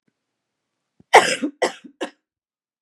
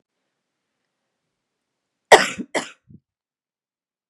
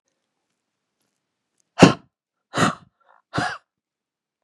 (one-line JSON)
{"cough_length": "2.8 s", "cough_amplitude": 32768, "cough_signal_mean_std_ratio": 0.25, "three_cough_length": "4.1 s", "three_cough_amplitude": 32768, "three_cough_signal_mean_std_ratio": 0.16, "exhalation_length": "4.4 s", "exhalation_amplitude": 32768, "exhalation_signal_mean_std_ratio": 0.2, "survey_phase": "beta (2021-08-13 to 2022-03-07)", "age": "45-64", "gender": "Female", "wearing_mask": "No", "symptom_cough_any": true, "symptom_change_to_sense_of_smell_or_taste": true, "smoker_status": "Never smoked", "respiratory_condition_asthma": true, "respiratory_condition_other": false, "recruitment_source": "REACT", "submission_delay": "1 day", "covid_test_result": "Negative", "covid_test_method": "RT-qPCR", "influenza_a_test_result": "Negative", "influenza_b_test_result": "Negative"}